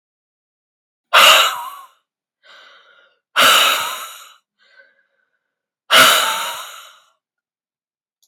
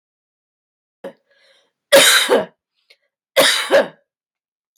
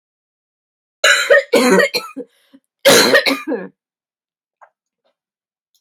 {
  "exhalation_length": "8.3 s",
  "exhalation_amplitude": 32768,
  "exhalation_signal_mean_std_ratio": 0.36,
  "three_cough_length": "4.8 s",
  "three_cough_amplitude": 32768,
  "three_cough_signal_mean_std_ratio": 0.35,
  "cough_length": "5.8 s",
  "cough_amplitude": 32768,
  "cough_signal_mean_std_ratio": 0.4,
  "survey_phase": "beta (2021-08-13 to 2022-03-07)",
  "age": "45-64",
  "gender": "Female",
  "wearing_mask": "No",
  "symptom_none": true,
  "smoker_status": "Never smoked",
  "respiratory_condition_asthma": false,
  "respiratory_condition_other": false,
  "recruitment_source": "REACT",
  "submission_delay": "1 day",
  "covid_test_result": "Negative",
  "covid_test_method": "RT-qPCR",
  "influenza_a_test_result": "Negative",
  "influenza_b_test_result": "Negative"
}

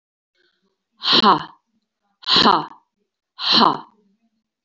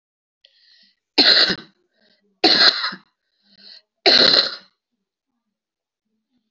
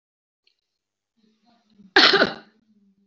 {
  "exhalation_length": "4.6 s",
  "exhalation_amplitude": 28064,
  "exhalation_signal_mean_std_ratio": 0.37,
  "three_cough_length": "6.5 s",
  "three_cough_amplitude": 32768,
  "three_cough_signal_mean_std_ratio": 0.35,
  "cough_length": "3.1 s",
  "cough_amplitude": 28981,
  "cough_signal_mean_std_ratio": 0.26,
  "survey_phase": "beta (2021-08-13 to 2022-03-07)",
  "age": "45-64",
  "gender": "Female",
  "wearing_mask": "No",
  "symptom_cough_any": true,
  "symptom_runny_or_blocked_nose": true,
  "symptom_sore_throat": true,
  "symptom_fatigue": true,
  "symptom_change_to_sense_of_smell_or_taste": true,
  "smoker_status": "Ex-smoker",
  "respiratory_condition_asthma": false,
  "respiratory_condition_other": false,
  "recruitment_source": "Test and Trace",
  "submission_delay": "1 day",
  "covid_test_result": "Positive",
  "covid_test_method": "RT-qPCR",
  "covid_ct_value": 27.0,
  "covid_ct_gene": "ORF1ab gene"
}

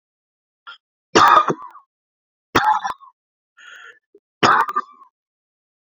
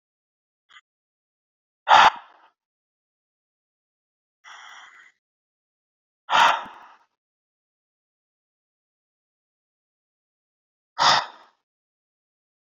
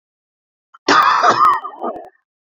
{
  "three_cough_length": "5.8 s",
  "three_cough_amplitude": 32767,
  "three_cough_signal_mean_std_ratio": 0.33,
  "exhalation_length": "12.6 s",
  "exhalation_amplitude": 29831,
  "exhalation_signal_mean_std_ratio": 0.19,
  "cough_length": "2.5 s",
  "cough_amplitude": 29081,
  "cough_signal_mean_std_ratio": 0.51,
  "survey_phase": "beta (2021-08-13 to 2022-03-07)",
  "age": "45-64",
  "gender": "Male",
  "wearing_mask": "No",
  "symptom_fatigue": true,
  "symptom_onset": "11 days",
  "smoker_status": "Never smoked",
  "respiratory_condition_asthma": false,
  "respiratory_condition_other": false,
  "recruitment_source": "REACT",
  "submission_delay": "2 days",
  "covid_test_result": "Negative",
  "covid_test_method": "RT-qPCR"
}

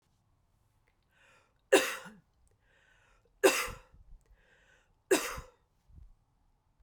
{
  "three_cough_length": "6.8 s",
  "three_cough_amplitude": 11003,
  "three_cough_signal_mean_std_ratio": 0.24,
  "survey_phase": "beta (2021-08-13 to 2022-03-07)",
  "age": "18-44",
  "gender": "Female",
  "wearing_mask": "No",
  "symptom_cough_any": true,
  "symptom_runny_or_blocked_nose": true,
  "symptom_sore_throat": true,
  "symptom_fatigue": true,
  "symptom_change_to_sense_of_smell_or_taste": true,
  "symptom_onset": "3 days",
  "smoker_status": "Never smoked",
  "respiratory_condition_asthma": false,
  "respiratory_condition_other": false,
  "recruitment_source": "Test and Trace",
  "submission_delay": "2 days",
  "covid_test_result": "Positive",
  "covid_test_method": "RT-qPCR"
}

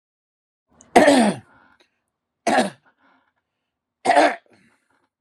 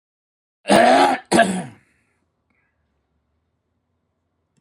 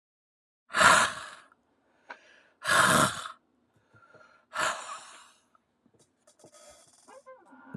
{
  "three_cough_length": "5.2 s",
  "three_cough_amplitude": 32767,
  "three_cough_signal_mean_std_ratio": 0.33,
  "cough_length": "4.6 s",
  "cough_amplitude": 29152,
  "cough_signal_mean_std_ratio": 0.33,
  "exhalation_length": "7.8 s",
  "exhalation_amplitude": 18894,
  "exhalation_signal_mean_std_ratio": 0.32,
  "survey_phase": "beta (2021-08-13 to 2022-03-07)",
  "age": "45-64",
  "gender": "Male",
  "wearing_mask": "No",
  "symptom_none": true,
  "symptom_onset": "12 days",
  "smoker_status": "Never smoked",
  "respiratory_condition_asthma": true,
  "respiratory_condition_other": false,
  "recruitment_source": "REACT",
  "submission_delay": "1 day",
  "covid_test_result": "Negative",
  "covid_test_method": "RT-qPCR"
}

